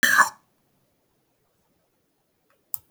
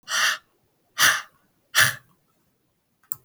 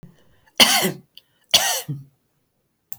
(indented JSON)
{
  "cough_length": "2.9 s",
  "cough_amplitude": 27341,
  "cough_signal_mean_std_ratio": 0.23,
  "exhalation_length": "3.2 s",
  "exhalation_amplitude": 29026,
  "exhalation_signal_mean_std_ratio": 0.35,
  "three_cough_length": "3.0 s",
  "three_cough_amplitude": 31883,
  "three_cough_signal_mean_std_ratio": 0.35,
  "survey_phase": "alpha (2021-03-01 to 2021-08-12)",
  "age": "65+",
  "gender": "Female",
  "wearing_mask": "No",
  "symptom_none": true,
  "smoker_status": "Ex-smoker",
  "respiratory_condition_asthma": false,
  "respiratory_condition_other": false,
  "recruitment_source": "REACT",
  "submission_delay": "1 day",
  "covid_test_result": "Negative",
  "covid_test_method": "RT-qPCR"
}